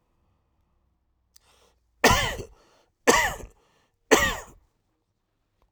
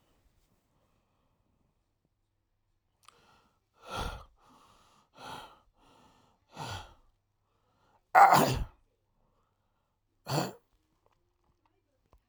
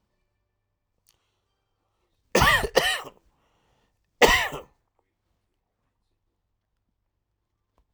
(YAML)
three_cough_length: 5.7 s
three_cough_amplitude: 24409
three_cough_signal_mean_std_ratio: 0.29
exhalation_length: 12.3 s
exhalation_amplitude: 19270
exhalation_signal_mean_std_ratio: 0.2
cough_length: 7.9 s
cough_amplitude: 30988
cough_signal_mean_std_ratio: 0.24
survey_phase: beta (2021-08-13 to 2022-03-07)
age: 18-44
gender: Male
wearing_mask: 'Yes'
symptom_cough_any: true
symptom_new_continuous_cough: true
symptom_shortness_of_breath: true
symptom_change_to_sense_of_smell_or_taste: true
symptom_loss_of_taste: true
smoker_status: Never smoked
respiratory_condition_asthma: false
respiratory_condition_other: false
recruitment_source: Test and Trace
submission_delay: 2 days
covid_test_result: Positive
covid_test_method: RT-qPCR
covid_ct_value: 30.2
covid_ct_gene: ORF1ab gene
covid_ct_mean: 31.8
covid_viral_load: 38 copies/ml
covid_viral_load_category: Minimal viral load (< 10K copies/ml)